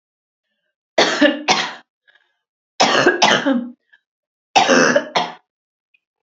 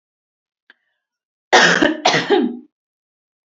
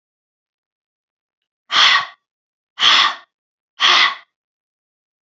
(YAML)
three_cough_length: 6.2 s
three_cough_amplitude: 32767
three_cough_signal_mean_std_ratio: 0.46
cough_length: 3.5 s
cough_amplitude: 30065
cough_signal_mean_std_ratio: 0.39
exhalation_length: 5.3 s
exhalation_amplitude: 31659
exhalation_signal_mean_std_ratio: 0.35
survey_phase: beta (2021-08-13 to 2022-03-07)
age: 18-44
gender: Female
wearing_mask: 'No'
symptom_cough_any: true
symptom_runny_or_blocked_nose: true
symptom_sore_throat: true
symptom_fatigue: true
smoker_status: Never smoked
respiratory_condition_asthma: false
respiratory_condition_other: false
recruitment_source: Test and Trace
submission_delay: 1 day
covid_test_result: Positive
covid_test_method: RT-qPCR
covid_ct_value: 20.8
covid_ct_gene: ORF1ab gene